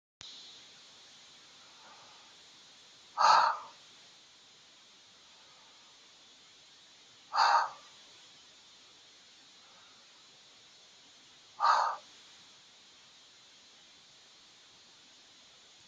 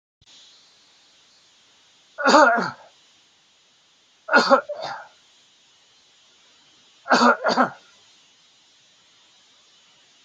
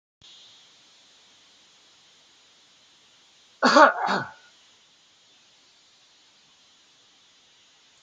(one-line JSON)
{"exhalation_length": "15.9 s", "exhalation_amplitude": 9474, "exhalation_signal_mean_std_ratio": 0.28, "three_cough_length": "10.2 s", "three_cough_amplitude": 28198, "three_cough_signal_mean_std_ratio": 0.3, "cough_length": "8.0 s", "cough_amplitude": 26919, "cough_signal_mean_std_ratio": 0.21, "survey_phase": "beta (2021-08-13 to 2022-03-07)", "age": "65+", "gender": "Male", "wearing_mask": "No", "symptom_none": true, "smoker_status": "Ex-smoker", "respiratory_condition_asthma": false, "respiratory_condition_other": false, "recruitment_source": "REACT", "submission_delay": "1 day", "covid_test_result": "Negative", "covid_test_method": "RT-qPCR"}